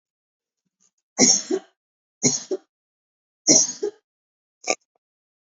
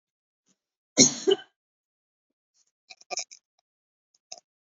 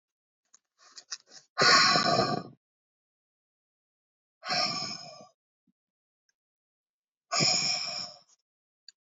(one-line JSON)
{"three_cough_length": "5.5 s", "three_cough_amplitude": 28004, "three_cough_signal_mean_std_ratio": 0.3, "cough_length": "4.7 s", "cough_amplitude": 25000, "cough_signal_mean_std_ratio": 0.19, "exhalation_length": "9.0 s", "exhalation_amplitude": 12248, "exhalation_signal_mean_std_ratio": 0.36, "survey_phase": "beta (2021-08-13 to 2022-03-07)", "age": "18-44", "gender": "Female", "wearing_mask": "No", "symptom_runny_or_blocked_nose": true, "smoker_status": "Current smoker (e-cigarettes or vapes only)", "respiratory_condition_asthma": false, "respiratory_condition_other": false, "recruitment_source": "REACT", "submission_delay": "1 day", "covid_test_result": "Negative", "covid_test_method": "RT-qPCR", "influenza_a_test_result": "Negative", "influenza_b_test_result": "Negative"}